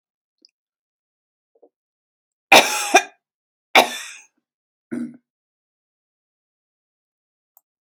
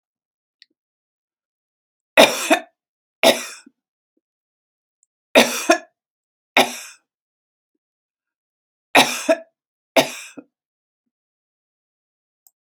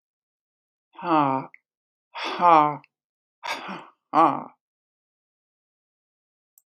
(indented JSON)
{
  "cough_length": "8.0 s",
  "cough_amplitude": 32768,
  "cough_signal_mean_std_ratio": 0.19,
  "three_cough_length": "12.7 s",
  "three_cough_amplitude": 32768,
  "three_cough_signal_mean_std_ratio": 0.24,
  "exhalation_length": "6.8 s",
  "exhalation_amplitude": 24028,
  "exhalation_signal_mean_std_ratio": 0.3,
  "survey_phase": "beta (2021-08-13 to 2022-03-07)",
  "age": "65+",
  "gender": "Female",
  "wearing_mask": "No",
  "symptom_none": true,
  "symptom_onset": "12 days",
  "smoker_status": "Ex-smoker",
  "respiratory_condition_asthma": false,
  "respiratory_condition_other": false,
  "recruitment_source": "REACT",
  "submission_delay": "2 days",
  "covid_test_result": "Negative",
  "covid_test_method": "RT-qPCR",
  "influenza_a_test_result": "Negative",
  "influenza_b_test_result": "Negative"
}